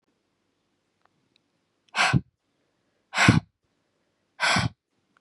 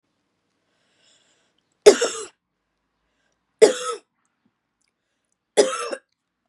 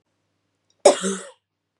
{"exhalation_length": "5.2 s", "exhalation_amplitude": 28955, "exhalation_signal_mean_std_ratio": 0.28, "three_cough_length": "6.5 s", "three_cough_amplitude": 32768, "three_cough_signal_mean_std_ratio": 0.21, "cough_length": "1.8 s", "cough_amplitude": 32175, "cough_signal_mean_std_ratio": 0.25, "survey_phase": "beta (2021-08-13 to 2022-03-07)", "age": "18-44", "gender": "Female", "wearing_mask": "No", "symptom_runny_or_blocked_nose": true, "symptom_fatigue": true, "symptom_headache": true, "smoker_status": "Never smoked", "respiratory_condition_asthma": false, "respiratory_condition_other": false, "recruitment_source": "Test and Trace", "submission_delay": "2 days", "covid_test_result": "Positive", "covid_test_method": "RT-qPCR", "covid_ct_value": 27.1, "covid_ct_gene": "ORF1ab gene", "covid_ct_mean": 27.4, "covid_viral_load": "1000 copies/ml", "covid_viral_load_category": "Minimal viral load (< 10K copies/ml)"}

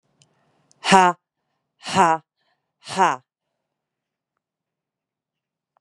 {"exhalation_length": "5.8 s", "exhalation_amplitude": 32767, "exhalation_signal_mean_std_ratio": 0.25, "survey_phase": "beta (2021-08-13 to 2022-03-07)", "age": "18-44", "gender": "Female", "wearing_mask": "No", "symptom_cough_any": true, "symptom_runny_or_blocked_nose": true, "symptom_sore_throat": true, "symptom_diarrhoea": true, "symptom_fatigue": true, "symptom_headache": true, "symptom_other": true, "symptom_onset": "2 days", "smoker_status": "Ex-smoker", "respiratory_condition_asthma": false, "respiratory_condition_other": false, "recruitment_source": "Test and Trace", "submission_delay": "2 days", "covid_test_result": "Positive", "covid_test_method": "RT-qPCR", "covid_ct_value": 25.0, "covid_ct_gene": "N gene"}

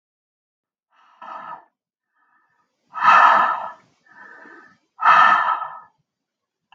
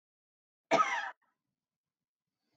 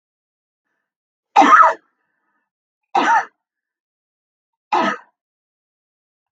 {"exhalation_length": "6.7 s", "exhalation_amplitude": 30635, "exhalation_signal_mean_std_ratio": 0.36, "cough_length": "2.6 s", "cough_amplitude": 5576, "cough_signal_mean_std_ratio": 0.27, "three_cough_length": "6.3 s", "three_cough_amplitude": 32766, "three_cough_signal_mean_std_ratio": 0.29, "survey_phase": "beta (2021-08-13 to 2022-03-07)", "age": "45-64", "gender": "Female", "wearing_mask": "No", "symptom_headache": true, "smoker_status": "Current smoker (11 or more cigarettes per day)", "respiratory_condition_asthma": false, "respiratory_condition_other": false, "recruitment_source": "Test and Trace", "submission_delay": "1 day", "covid_test_result": "Positive", "covid_test_method": "RT-qPCR", "covid_ct_value": 34.9, "covid_ct_gene": "S gene"}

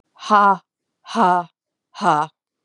{"exhalation_length": "2.6 s", "exhalation_amplitude": 26571, "exhalation_signal_mean_std_ratio": 0.43, "survey_phase": "beta (2021-08-13 to 2022-03-07)", "age": "18-44", "gender": "Female", "wearing_mask": "No", "symptom_cough_any": true, "symptom_runny_or_blocked_nose": true, "symptom_sore_throat": true, "symptom_abdominal_pain": true, "symptom_diarrhoea": true, "symptom_fatigue": true, "symptom_fever_high_temperature": true, "smoker_status": "Ex-smoker", "respiratory_condition_asthma": false, "respiratory_condition_other": false, "recruitment_source": "Test and Trace", "submission_delay": "2 days", "covid_test_result": "Positive", "covid_test_method": "LFT"}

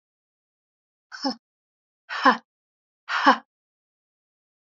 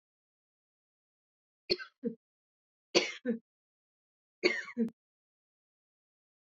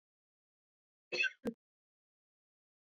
{"exhalation_length": "4.8 s", "exhalation_amplitude": 24801, "exhalation_signal_mean_std_ratio": 0.23, "three_cough_length": "6.6 s", "three_cough_amplitude": 10425, "three_cough_signal_mean_std_ratio": 0.24, "cough_length": "2.8 s", "cough_amplitude": 2195, "cough_signal_mean_std_ratio": 0.23, "survey_phase": "beta (2021-08-13 to 2022-03-07)", "age": "45-64", "gender": "Female", "wearing_mask": "No", "symptom_cough_any": true, "symptom_fatigue": true, "symptom_headache": true, "symptom_onset": "3 days", "smoker_status": "Never smoked", "respiratory_condition_asthma": false, "respiratory_condition_other": false, "recruitment_source": "Test and Trace", "submission_delay": "2 days", "covid_test_result": "Positive", "covid_test_method": "ePCR"}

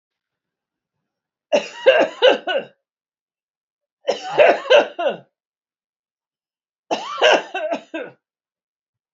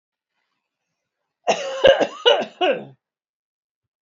{"three_cough_length": "9.1 s", "three_cough_amplitude": 27604, "three_cough_signal_mean_std_ratio": 0.35, "cough_length": "4.0 s", "cough_amplitude": 27636, "cough_signal_mean_std_ratio": 0.34, "survey_phase": "beta (2021-08-13 to 2022-03-07)", "age": "65+", "gender": "Female", "wearing_mask": "No", "symptom_none": true, "smoker_status": "Ex-smoker", "respiratory_condition_asthma": false, "respiratory_condition_other": false, "recruitment_source": "REACT", "submission_delay": "6 days", "covid_test_result": "Negative", "covid_test_method": "RT-qPCR", "influenza_a_test_result": "Negative", "influenza_b_test_result": "Negative"}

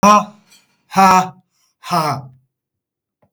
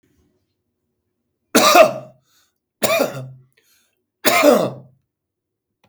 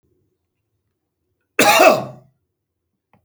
{"exhalation_length": "3.3 s", "exhalation_amplitude": 32766, "exhalation_signal_mean_std_ratio": 0.39, "three_cough_length": "5.9 s", "three_cough_amplitude": 32768, "three_cough_signal_mean_std_ratio": 0.34, "cough_length": "3.2 s", "cough_amplitude": 32768, "cough_signal_mean_std_ratio": 0.29, "survey_phase": "beta (2021-08-13 to 2022-03-07)", "age": "65+", "gender": "Male", "wearing_mask": "No", "symptom_none": true, "smoker_status": "Ex-smoker", "respiratory_condition_asthma": false, "respiratory_condition_other": true, "recruitment_source": "REACT", "submission_delay": "7 days", "covid_test_result": "Negative", "covid_test_method": "RT-qPCR", "influenza_a_test_result": "Negative", "influenza_b_test_result": "Negative"}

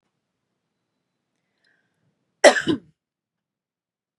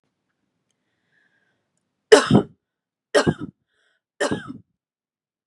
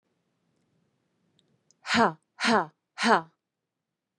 {"cough_length": "4.2 s", "cough_amplitude": 32767, "cough_signal_mean_std_ratio": 0.16, "three_cough_length": "5.5 s", "three_cough_amplitude": 32768, "three_cough_signal_mean_std_ratio": 0.23, "exhalation_length": "4.2 s", "exhalation_amplitude": 16658, "exhalation_signal_mean_std_ratio": 0.28, "survey_phase": "beta (2021-08-13 to 2022-03-07)", "age": "18-44", "gender": "Female", "wearing_mask": "No", "symptom_none": true, "smoker_status": "Never smoked", "respiratory_condition_asthma": false, "respiratory_condition_other": false, "recruitment_source": "REACT", "submission_delay": "2 days", "covid_test_result": "Negative", "covid_test_method": "RT-qPCR", "influenza_a_test_result": "Negative", "influenza_b_test_result": "Negative"}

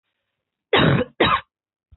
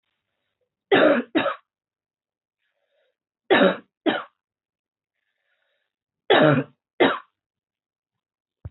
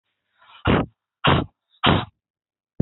{"cough_length": "2.0 s", "cough_amplitude": 24453, "cough_signal_mean_std_ratio": 0.43, "three_cough_length": "8.7 s", "three_cough_amplitude": 22564, "three_cough_signal_mean_std_ratio": 0.31, "exhalation_length": "2.8 s", "exhalation_amplitude": 24722, "exhalation_signal_mean_std_ratio": 0.37, "survey_phase": "beta (2021-08-13 to 2022-03-07)", "age": "18-44", "gender": "Female", "wearing_mask": "No", "symptom_runny_or_blocked_nose": true, "symptom_sore_throat": true, "symptom_fatigue": true, "symptom_headache": true, "smoker_status": "Never smoked", "respiratory_condition_asthma": true, "respiratory_condition_other": false, "recruitment_source": "Test and Trace", "submission_delay": "1 day", "covid_test_result": "Positive", "covid_test_method": "RT-qPCR", "covid_ct_value": 25.8, "covid_ct_gene": "ORF1ab gene"}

